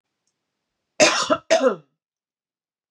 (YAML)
cough_length: 2.9 s
cough_amplitude: 27880
cough_signal_mean_std_ratio: 0.34
survey_phase: beta (2021-08-13 to 2022-03-07)
age: 45-64
gender: Female
wearing_mask: 'No'
symptom_cough_any: true
symptom_headache: true
symptom_other: true
smoker_status: Never smoked
respiratory_condition_asthma: false
respiratory_condition_other: false
recruitment_source: Test and Trace
submission_delay: 2 days
covid_test_result: Positive
covid_test_method: ePCR